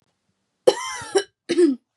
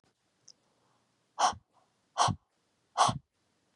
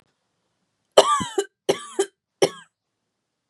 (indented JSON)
{
  "cough_length": "2.0 s",
  "cough_amplitude": 30523,
  "cough_signal_mean_std_ratio": 0.4,
  "exhalation_length": "3.8 s",
  "exhalation_amplitude": 8956,
  "exhalation_signal_mean_std_ratio": 0.28,
  "three_cough_length": "3.5 s",
  "three_cough_amplitude": 32767,
  "three_cough_signal_mean_std_ratio": 0.28,
  "survey_phase": "beta (2021-08-13 to 2022-03-07)",
  "age": "18-44",
  "gender": "Female",
  "wearing_mask": "No",
  "symptom_none": true,
  "smoker_status": "Never smoked",
  "respiratory_condition_asthma": false,
  "respiratory_condition_other": false,
  "recruitment_source": "REACT",
  "submission_delay": "1 day",
  "covid_test_result": "Negative",
  "covid_test_method": "RT-qPCR"
}